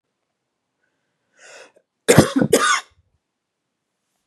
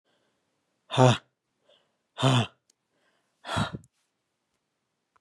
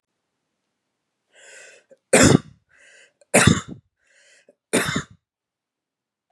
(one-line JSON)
{"cough_length": "4.3 s", "cough_amplitude": 32768, "cough_signal_mean_std_ratio": 0.27, "exhalation_length": "5.2 s", "exhalation_amplitude": 18341, "exhalation_signal_mean_std_ratio": 0.27, "three_cough_length": "6.3 s", "three_cough_amplitude": 32767, "three_cough_signal_mean_std_ratio": 0.26, "survey_phase": "beta (2021-08-13 to 2022-03-07)", "age": "45-64", "gender": "Male", "wearing_mask": "No", "symptom_none": true, "smoker_status": "Never smoked", "respiratory_condition_asthma": false, "respiratory_condition_other": false, "recruitment_source": "REACT", "submission_delay": "2 days", "covid_test_result": "Negative", "covid_test_method": "RT-qPCR"}